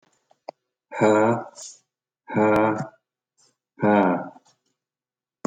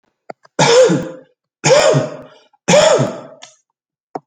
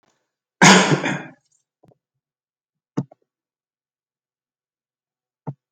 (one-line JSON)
{"exhalation_length": "5.5 s", "exhalation_amplitude": 17090, "exhalation_signal_mean_std_ratio": 0.42, "three_cough_length": "4.3 s", "three_cough_amplitude": 31164, "three_cough_signal_mean_std_ratio": 0.51, "cough_length": "5.7 s", "cough_amplitude": 32768, "cough_signal_mean_std_ratio": 0.23, "survey_phase": "beta (2021-08-13 to 2022-03-07)", "age": "45-64", "gender": "Male", "wearing_mask": "No", "symptom_none": true, "smoker_status": "Never smoked", "respiratory_condition_asthma": false, "respiratory_condition_other": false, "recruitment_source": "REACT", "submission_delay": "10 days", "covid_test_result": "Negative", "covid_test_method": "RT-qPCR"}